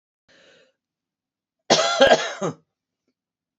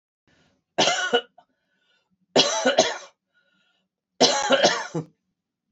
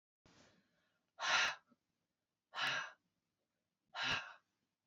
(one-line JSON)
{"cough_length": "3.6 s", "cough_amplitude": 26958, "cough_signal_mean_std_ratio": 0.32, "three_cough_length": "5.7 s", "three_cough_amplitude": 22660, "three_cough_signal_mean_std_ratio": 0.41, "exhalation_length": "4.9 s", "exhalation_amplitude": 2790, "exhalation_signal_mean_std_ratio": 0.36, "survey_phase": "beta (2021-08-13 to 2022-03-07)", "age": "65+", "gender": "Female", "wearing_mask": "No", "symptom_cough_any": true, "symptom_runny_or_blocked_nose": true, "smoker_status": "Never smoked", "respiratory_condition_asthma": false, "respiratory_condition_other": false, "recruitment_source": "Test and Trace", "submission_delay": "0 days", "covid_test_result": "Negative", "covid_test_method": "LFT"}